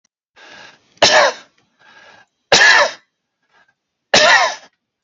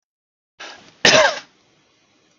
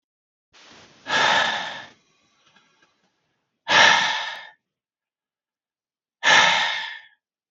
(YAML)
three_cough_length: 5.0 s
three_cough_amplitude: 32768
three_cough_signal_mean_std_ratio: 0.39
cough_length: 2.4 s
cough_amplitude: 32768
cough_signal_mean_std_ratio: 0.3
exhalation_length: 7.5 s
exhalation_amplitude: 32733
exhalation_signal_mean_std_ratio: 0.39
survey_phase: beta (2021-08-13 to 2022-03-07)
age: 45-64
gender: Male
wearing_mask: 'No'
symptom_none: true
smoker_status: Never smoked
respiratory_condition_asthma: false
respiratory_condition_other: false
recruitment_source: REACT
submission_delay: 1 day
covid_test_result: Negative
covid_test_method: RT-qPCR
influenza_a_test_result: Negative
influenza_b_test_result: Negative